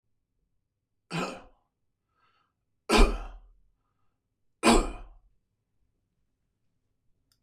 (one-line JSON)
{"three_cough_length": "7.4 s", "three_cough_amplitude": 15514, "three_cough_signal_mean_std_ratio": 0.23, "survey_phase": "beta (2021-08-13 to 2022-03-07)", "age": "45-64", "gender": "Male", "wearing_mask": "No", "symptom_none": true, "smoker_status": "Ex-smoker", "respiratory_condition_asthma": false, "respiratory_condition_other": false, "recruitment_source": "REACT", "submission_delay": "2 days", "covid_test_result": "Negative", "covid_test_method": "RT-qPCR", "influenza_a_test_result": "Negative", "influenza_b_test_result": "Negative"}